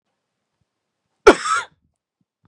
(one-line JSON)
{"cough_length": "2.5 s", "cough_amplitude": 32768, "cough_signal_mean_std_ratio": 0.21, "survey_phase": "beta (2021-08-13 to 2022-03-07)", "age": "18-44", "gender": "Male", "wearing_mask": "No", "symptom_cough_any": true, "symptom_runny_or_blocked_nose": true, "symptom_sore_throat": true, "symptom_onset": "3 days", "smoker_status": "Never smoked", "respiratory_condition_asthma": false, "respiratory_condition_other": false, "recruitment_source": "Test and Trace", "submission_delay": "2 days", "covid_test_result": "Positive", "covid_test_method": "RT-qPCR", "covid_ct_value": 27.9, "covid_ct_gene": "ORF1ab gene", "covid_ct_mean": 28.9, "covid_viral_load": "340 copies/ml", "covid_viral_load_category": "Minimal viral load (< 10K copies/ml)"}